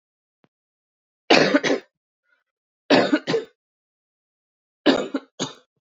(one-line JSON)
{"three_cough_length": "5.9 s", "three_cough_amplitude": 32108, "three_cough_signal_mean_std_ratio": 0.33, "survey_phase": "beta (2021-08-13 to 2022-03-07)", "age": "18-44", "gender": "Female", "wearing_mask": "No", "symptom_cough_any": true, "symptom_runny_or_blocked_nose": true, "symptom_sore_throat": true, "symptom_fever_high_temperature": true, "symptom_headache": true, "symptom_onset": "4 days", "smoker_status": "Never smoked", "respiratory_condition_asthma": false, "respiratory_condition_other": false, "recruitment_source": "Test and Trace", "submission_delay": "2 days", "covid_test_result": "Positive", "covid_test_method": "RT-qPCR", "covid_ct_value": 30.0, "covid_ct_gene": "ORF1ab gene"}